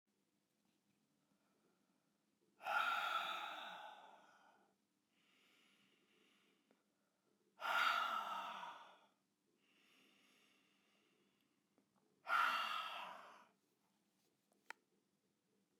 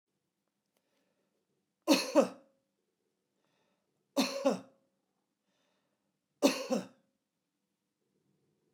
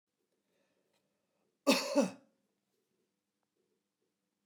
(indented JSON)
{
  "exhalation_length": "15.8 s",
  "exhalation_amplitude": 1694,
  "exhalation_signal_mean_std_ratio": 0.36,
  "three_cough_length": "8.7 s",
  "three_cough_amplitude": 7920,
  "three_cough_signal_mean_std_ratio": 0.25,
  "cough_length": "4.5 s",
  "cough_amplitude": 5777,
  "cough_signal_mean_std_ratio": 0.22,
  "survey_phase": "beta (2021-08-13 to 2022-03-07)",
  "age": "65+",
  "gender": "Male",
  "wearing_mask": "No",
  "symptom_none": true,
  "smoker_status": "Ex-smoker",
  "respiratory_condition_asthma": false,
  "respiratory_condition_other": false,
  "recruitment_source": "REACT",
  "submission_delay": "1 day",
  "covid_test_result": "Negative",
  "covid_test_method": "RT-qPCR"
}